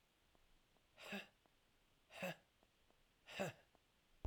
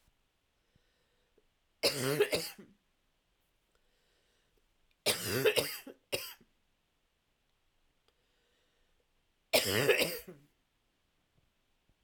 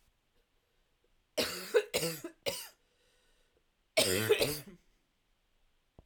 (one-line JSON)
{"exhalation_length": "4.3 s", "exhalation_amplitude": 1061, "exhalation_signal_mean_std_ratio": 0.35, "three_cough_length": "12.0 s", "three_cough_amplitude": 7725, "three_cough_signal_mean_std_ratio": 0.31, "cough_length": "6.1 s", "cough_amplitude": 6175, "cough_signal_mean_std_ratio": 0.36, "survey_phase": "alpha (2021-03-01 to 2021-08-12)", "age": "45-64", "gender": "Female", "wearing_mask": "No", "symptom_cough_any": true, "symptom_shortness_of_breath": true, "smoker_status": "Ex-smoker", "respiratory_condition_asthma": false, "respiratory_condition_other": true, "recruitment_source": "REACT", "submission_delay": "2 days", "covid_test_result": "Negative", "covid_test_method": "RT-qPCR"}